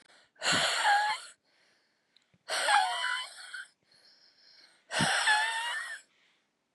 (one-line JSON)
{"exhalation_length": "6.7 s", "exhalation_amplitude": 9244, "exhalation_signal_mean_std_ratio": 0.53, "survey_phase": "beta (2021-08-13 to 2022-03-07)", "age": "45-64", "gender": "Female", "wearing_mask": "No", "symptom_cough_any": true, "symptom_new_continuous_cough": true, "symptom_runny_or_blocked_nose": true, "symptom_shortness_of_breath": true, "symptom_sore_throat": true, "symptom_abdominal_pain": true, "symptom_fatigue": true, "symptom_fever_high_temperature": true, "symptom_headache": true, "symptom_change_to_sense_of_smell_or_taste": true, "symptom_other": true, "smoker_status": "Ex-smoker", "respiratory_condition_asthma": false, "respiratory_condition_other": false, "recruitment_source": "Test and Trace", "submission_delay": "1 day", "covid_test_result": "Positive", "covid_test_method": "RT-qPCR", "covid_ct_value": 27.9, "covid_ct_gene": "N gene"}